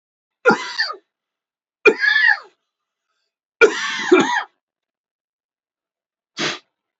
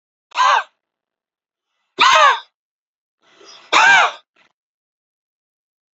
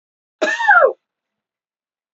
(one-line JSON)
{"three_cough_length": "7.0 s", "three_cough_amplitude": 28393, "three_cough_signal_mean_std_ratio": 0.35, "exhalation_length": "6.0 s", "exhalation_amplitude": 30712, "exhalation_signal_mean_std_ratio": 0.35, "cough_length": "2.1 s", "cough_amplitude": 29735, "cough_signal_mean_std_ratio": 0.37, "survey_phase": "alpha (2021-03-01 to 2021-08-12)", "age": "45-64", "gender": "Male", "wearing_mask": "No", "symptom_cough_any": true, "symptom_fatigue": true, "symptom_headache": true, "symptom_onset": "4 days", "smoker_status": "Never smoked", "respiratory_condition_asthma": false, "respiratory_condition_other": false, "recruitment_source": "Test and Trace", "submission_delay": "2 days", "covid_test_result": "Positive", "covid_test_method": "RT-qPCR", "covid_ct_value": 22.7, "covid_ct_gene": "N gene", "covid_ct_mean": 22.9, "covid_viral_load": "32000 copies/ml", "covid_viral_load_category": "Low viral load (10K-1M copies/ml)"}